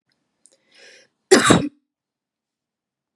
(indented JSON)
{
  "cough_length": "3.2 s",
  "cough_amplitude": 32768,
  "cough_signal_mean_std_ratio": 0.25,
  "survey_phase": "beta (2021-08-13 to 2022-03-07)",
  "age": "18-44",
  "gender": "Female",
  "wearing_mask": "No",
  "symptom_fatigue": true,
  "smoker_status": "Never smoked",
  "respiratory_condition_asthma": false,
  "respiratory_condition_other": false,
  "recruitment_source": "REACT",
  "submission_delay": "3 days",
  "covid_test_result": "Negative",
  "covid_test_method": "RT-qPCR",
  "influenza_a_test_result": "Negative",
  "influenza_b_test_result": "Negative"
}